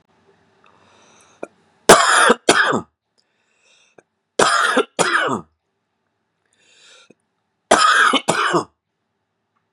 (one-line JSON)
{"three_cough_length": "9.7 s", "three_cough_amplitude": 32768, "three_cough_signal_mean_std_ratio": 0.38, "survey_phase": "beta (2021-08-13 to 2022-03-07)", "age": "18-44", "gender": "Male", "wearing_mask": "No", "symptom_cough_any": true, "symptom_new_continuous_cough": true, "symptom_sore_throat": true, "symptom_onset": "2 days", "smoker_status": "Ex-smoker", "respiratory_condition_asthma": false, "respiratory_condition_other": false, "recruitment_source": "Test and Trace", "submission_delay": "1 day", "covid_test_method": "RT-qPCR"}